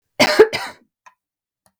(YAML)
cough_length: 1.8 s
cough_amplitude: 32768
cough_signal_mean_std_ratio: 0.31
survey_phase: beta (2021-08-13 to 2022-03-07)
age: 45-64
gender: Female
wearing_mask: 'No'
symptom_none: true
smoker_status: Never smoked
respiratory_condition_asthma: false
respiratory_condition_other: false
recruitment_source: REACT
submission_delay: 1 day
covid_test_result: Negative
covid_test_method: RT-qPCR